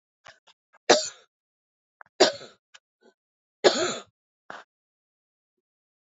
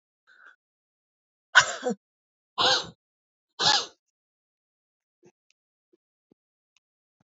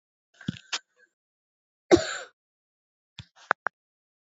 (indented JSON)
{
  "three_cough_length": "6.1 s",
  "three_cough_amplitude": 24963,
  "three_cough_signal_mean_std_ratio": 0.22,
  "exhalation_length": "7.3 s",
  "exhalation_amplitude": 27270,
  "exhalation_signal_mean_std_ratio": 0.23,
  "cough_length": "4.4 s",
  "cough_amplitude": 27258,
  "cough_signal_mean_std_ratio": 0.17,
  "survey_phase": "beta (2021-08-13 to 2022-03-07)",
  "age": "45-64",
  "gender": "Female",
  "wearing_mask": "No",
  "symptom_cough_any": true,
  "symptom_sore_throat": true,
  "symptom_fatigue": true,
  "symptom_change_to_sense_of_smell_or_taste": true,
  "symptom_loss_of_taste": true,
  "symptom_onset": "5 days",
  "smoker_status": "Never smoked",
  "respiratory_condition_asthma": false,
  "respiratory_condition_other": false,
  "recruitment_source": "REACT",
  "submission_delay": "2 days",
  "covid_test_result": "Positive",
  "covid_test_method": "RT-qPCR",
  "covid_ct_value": 21.8,
  "covid_ct_gene": "E gene",
  "influenza_a_test_result": "Negative",
  "influenza_b_test_result": "Negative"
}